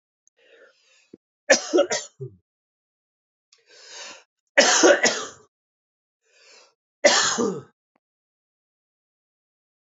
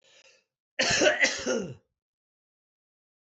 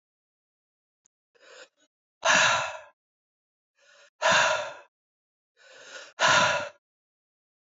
{"three_cough_length": "9.9 s", "three_cough_amplitude": 25938, "three_cough_signal_mean_std_ratio": 0.3, "cough_length": "3.2 s", "cough_amplitude": 12178, "cough_signal_mean_std_ratio": 0.4, "exhalation_length": "7.7 s", "exhalation_amplitude": 13580, "exhalation_signal_mean_std_ratio": 0.35, "survey_phase": "beta (2021-08-13 to 2022-03-07)", "age": "45-64", "gender": "Male", "wearing_mask": "No", "symptom_none": true, "smoker_status": "Never smoked", "respiratory_condition_asthma": false, "respiratory_condition_other": false, "recruitment_source": "REACT", "submission_delay": "3 days", "covid_test_result": "Negative", "covid_test_method": "RT-qPCR"}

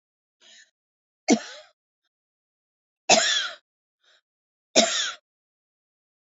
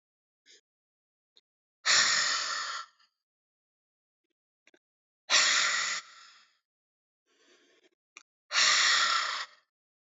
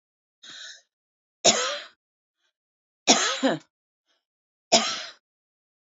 {"three_cough_length": "6.2 s", "three_cough_amplitude": 26672, "three_cough_signal_mean_std_ratio": 0.27, "exhalation_length": "10.2 s", "exhalation_amplitude": 10703, "exhalation_signal_mean_std_ratio": 0.4, "cough_length": "5.8 s", "cough_amplitude": 27514, "cough_signal_mean_std_ratio": 0.31, "survey_phase": "alpha (2021-03-01 to 2021-08-12)", "age": "45-64", "gender": "Female", "wearing_mask": "No", "symptom_headache": true, "smoker_status": "Ex-smoker", "respiratory_condition_asthma": true, "respiratory_condition_other": false, "recruitment_source": "REACT", "submission_delay": "2 days", "covid_test_result": "Negative", "covid_test_method": "RT-qPCR"}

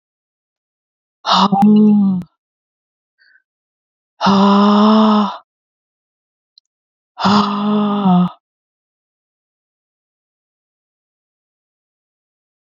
{"exhalation_length": "12.6 s", "exhalation_amplitude": 32767, "exhalation_signal_mean_std_ratio": 0.44, "survey_phase": "beta (2021-08-13 to 2022-03-07)", "age": "45-64", "gender": "Female", "wearing_mask": "No", "symptom_cough_any": true, "symptom_runny_or_blocked_nose": true, "symptom_sore_throat": true, "symptom_abdominal_pain": true, "symptom_fatigue": true, "symptom_fever_high_temperature": true, "symptom_headache": true, "symptom_onset": "3 days", "smoker_status": "Never smoked", "respiratory_condition_asthma": false, "respiratory_condition_other": false, "recruitment_source": "Test and Trace", "submission_delay": "2 days", "covid_test_result": "Positive", "covid_test_method": "RT-qPCR", "covid_ct_value": 19.3, "covid_ct_gene": "N gene", "covid_ct_mean": 19.3, "covid_viral_load": "460000 copies/ml", "covid_viral_load_category": "Low viral load (10K-1M copies/ml)"}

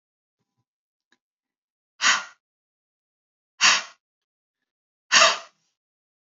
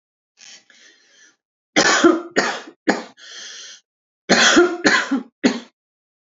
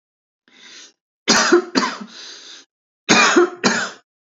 {"exhalation_length": "6.2 s", "exhalation_amplitude": 24533, "exhalation_signal_mean_std_ratio": 0.24, "three_cough_length": "6.3 s", "three_cough_amplitude": 29463, "three_cough_signal_mean_std_ratio": 0.43, "cough_length": "4.4 s", "cough_amplitude": 32768, "cough_signal_mean_std_ratio": 0.45, "survey_phase": "beta (2021-08-13 to 2022-03-07)", "age": "45-64", "gender": "Male", "wearing_mask": "No", "symptom_sore_throat": true, "symptom_onset": "2 days", "smoker_status": "Never smoked", "respiratory_condition_asthma": false, "respiratory_condition_other": false, "recruitment_source": "Test and Trace", "submission_delay": "1 day", "covid_test_result": "Positive", "covid_test_method": "ePCR"}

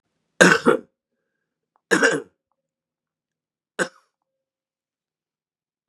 {"three_cough_length": "5.9 s", "three_cough_amplitude": 32768, "three_cough_signal_mean_std_ratio": 0.24, "survey_phase": "beta (2021-08-13 to 2022-03-07)", "age": "45-64", "gender": "Male", "wearing_mask": "No", "symptom_cough_any": true, "symptom_runny_or_blocked_nose": true, "symptom_shortness_of_breath": true, "symptom_sore_throat": true, "symptom_headache": true, "symptom_onset": "3 days", "smoker_status": "Ex-smoker", "respiratory_condition_asthma": false, "respiratory_condition_other": false, "recruitment_source": "Test and Trace", "submission_delay": "1 day", "covid_test_result": "Positive", "covid_test_method": "RT-qPCR", "covid_ct_value": 27.3, "covid_ct_gene": "N gene"}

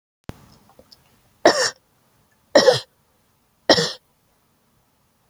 {"three_cough_length": "5.3 s", "three_cough_amplitude": 29155, "three_cough_signal_mean_std_ratio": 0.26, "survey_phase": "alpha (2021-03-01 to 2021-08-12)", "age": "45-64", "gender": "Female", "wearing_mask": "No", "symptom_none": true, "smoker_status": "Never smoked", "respiratory_condition_asthma": false, "respiratory_condition_other": false, "recruitment_source": "REACT", "submission_delay": "2 days", "covid_test_result": "Negative", "covid_test_method": "RT-qPCR"}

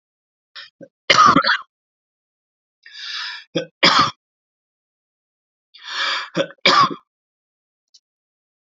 {"three_cough_length": "8.6 s", "three_cough_amplitude": 30396, "three_cough_signal_mean_std_ratio": 0.33, "survey_phase": "beta (2021-08-13 to 2022-03-07)", "age": "45-64", "gender": "Male", "wearing_mask": "No", "symptom_none": true, "smoker_status": "Ex-smoker", "respiratory_condition_asthma": false, "respiratory_condition_other": false, "recruitment_source": "REACT", "submission_delay": "11 days", "covid_test_result": "Negative", "covid_test_method": "RT-qPCR", "influenza_a_test_result": "Negative", "influenza_b_test_result": "Negative"}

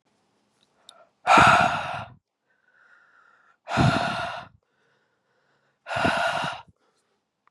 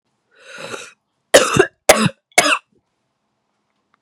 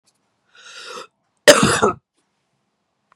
{"exhalation_length": "7.5 s", "exhalation_amplitude": 24920, "exhalation_signal_mean_std_ratio": 0.37, "three_cough_length": "4.0 s", "three_cough_amplitude": 32768, "three_cough_signal_mean_std_ratio": 0.31, "cough_length": "3.2 s", "cough_amplitude": 32768, "cough_signal_mean_std_ratio": 0.28, "survey_phase": "beta (2021-08-13 to 2022-03-07)", "age": "18-44", "gender": "Female", "wearing_mask": "No", "symptom_cough_any": true, "symptom_new_continuous_cough": true, "symptom_runny_or_blocked_nose": true, "symptom_shortness_of_breath": true, "symptom_abdominal_pain": true, "symptom_fatigue": true, "symptom_fever_high_temperature": true, "symptom_headache": true, "smoker_status": "Never smoked", "respiratory_condition_asthma": false, "respiratory_condition_other": false, "recruitment_source": "Test and Trace", "submission_delay": "2 days", "covid_test_result": "Positive", "covid_test_method": "RT-qPCR", "covid_ct_value": 17.7, "covid_ct_gene": "ORF1ab gene", "covid_ct_mean": 17.7, "covid_viral_load": "1600000 copies/ml", "covid_viral_load_category": "High viral load (>1M copies/ml)"}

